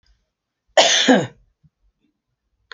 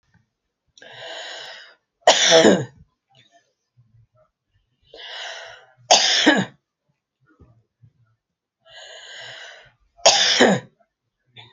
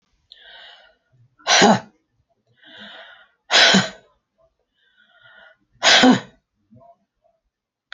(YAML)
cough_length: 2.7 s
cough_amplitude: 32767
cough_signal_mean_std_ratio: 0.33
three_cough_length: 11.5 s
three_cough_amplitude: 32768
three_cough_signal_mean_std_ratio: 0.32
exhalation_length: 7.9 s
exhalation_amplitude: 30565
exhalation_signal_mean_std_ratio: 0.31
survey_phase: alpha (2021-03-01 to 2021-08-12)
age: 65+
gender: Female
wearing_mask: 'No'
symptom_none: true
symptom_new_continuous_cough: true
smoker_status: Ex-smoker
respiratory_condition_asthma: false
respiratory_condition_other: false
recruitment_source: REACT
submission_delay: 2 days
covid_test_result: Negative
covid_test_method: RT-qPCR